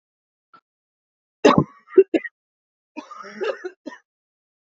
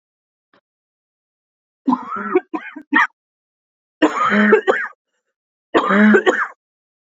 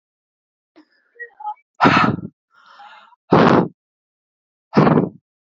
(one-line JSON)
{"cough_length": "4.7 s", "cough_amplitude": 27343, "cough_signal_mean_std_ratio": 0.23, "three_cough_length": "7.2 s", "three_cough_amplitude": 29076, "three_cough_signal_mean_std_ratio": 0.42, "exhalation_length": "5.5 s", "exhalation_amplitude": 29518, "exhalation_signal_mean_std_ratio": 0.36, "survey_phase": "beta (2021-08-13 to 2022-03-07)", "age": "18-44", "gender": "Female", "wearing_mask": "Yes", "symptom_cough_any": true, "symptom_shortness_of_breath": true, "symptom_sore_throat": true, "symptom_fatigue": true, "symptom_fever_high_temperature": true, "symptom_headache": true, "symptom_other": true, "smoker_status": "Never smoked", "respiratory_condition_asthma": true, "respiratory_condition_other": false, "recruitment_source": "Test and Trace", "submission_delay": "7 days", "covid_test_result": "Negative", "covid_test_method": "RT-qPCR"}